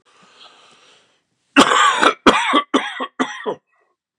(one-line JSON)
{"cough_length": "4.2 s", "cough_amplitude": 32768, "cough_signal_mean_std_ratio": 0.43, "survey_phase": "beta (2021-08-13 to 2022-03-07)", "age": "65+", "gender": "Male", "wearing_mask": "No", "symptom_cough_any": true, "symptom_runny_or_blocked_nose": true, "symptom_sore_throat": true, "symptom_other": true, "symptom_onset": "3 days", "smoker_status": "Never smoked", "respiratory_condition_asthma": false, "respiratory_condition_other": false, "recruitment_source": "Test and Trace", "submission_delay": "2 days", "covid_test_result": "Positive", "covid_test_method": "RT-qPCR", "covid_ct_value": 19.8, "covid_ct_gene": "ORF1ab gene", "covid_ct_mean": 20.2, "covid_viral_load": "240000 copies/ml", "covid_viral_load_category": "Low viral load (10K-1M copies/ml)"}